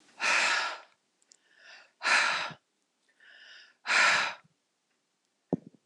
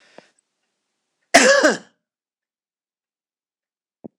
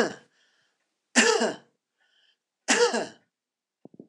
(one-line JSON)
{"exhalation_length": "5.9 s", "exhalation_amplitude": 8432, "exhalation_signal_mean_std_ratio": 0.42, "cough_length": "4.2 s", "cough_amplitude": 26028, "cough_signal_mean_std_ratio": 0.24, "three_cough_length": "4.1 s", "three_cough_amplitude": 20031, "three_cough_signal_mean_std_ratio": 0.35, "survey_phase": "beta (2021-08-13 to 2022-03-07)", "age": "65+", "gender": "Female", "wearing_mask": "No", "symptom_none": true, "symptom_onset": "6 days", "smoker_status": "Never smoked", "respiratory_condition_asthma": false, "respiratory_condition_other": false, "recruitment_source": "REACT", "submission_delay": "4 days", "covid_test_result": "Negative", "covid_test_method": "RT-qPCR", "influenza_a_test_result": "Negative", "influenza_b_test_result": "Negative"}